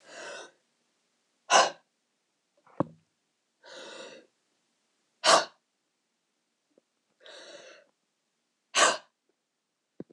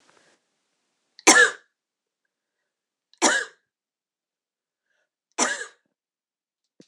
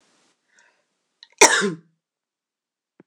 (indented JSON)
{
  "exhalation_length": "10.1 s",
  "exhalation_amplitude": 16050,
  "exhalation_signal_mean_std_ratio": 0.22,
  "three_cough_length": "6.9 s",
  "three_cough_amplitude": 26028,
  "three_cough_signal_mean_std_ratio": 0.22,
  "cough_length": "3.1 s",
  "cough_amplitude": 26028,
  "cough_signal_mean_std_ratio": 0.22,
  "survey_phase": "beta (2021-08-13 to 2022-03-07)",
  "age": "45-64",
  "gender": "Female",
  "wearing_mask": "No",
  "symptom_cough_any": true,
  "symptom_runny_or_blocked_nose": true,
  "symptom_sore_throat": true,
  "symptom_headache": true,
  "symptom_change_to_sense_of_smell_or_taste": true,
  "symptom_loss_of_taste": true,
  "smoker_status": "Ex-smoker",
  "respiratory_condition_asthma": false,
  "respiratory_condition_other": false,
  "recruitment_source": "Test and Trace",
  "submission_delay": "1 day",
  "covid_test_result": "Positive",
  "covid_test_method": "LFT"
}